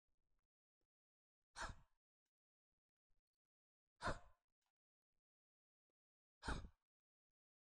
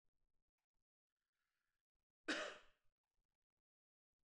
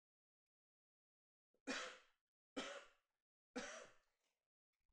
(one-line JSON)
{"exhalation_length": "7.6 s", "exhalation_amplitude": 768, "exhalation_signal_mean_std_ratio": 0.21, "cough_length": "4.3 s", "cough_amplitude": 1157, "cough_signal_mean_std_ratio": 0.2, "three_cough_length": "4.9 s", "three_cough_amplitude": 671, "three_cough_signal_mean_std_ratio": 0.33, "survey_phase": "beta (2021-08-13 to 2022-03-07)", "age": "18-44", "gender": "Male", "wearing_mask": "No", "symptom_none": true, "smoker_status": "Never smoked", "respiratory_condition_asthma": true, "respiratory_condition_other": false, "recruitment_source": "REACT", "submission_delay": "1 day", "covid_test_result": "Negative", "covid_test_method": "RT-qPCR", "influenza_a_test_result": "Negative", "influenza_b_test_result": "Negative"}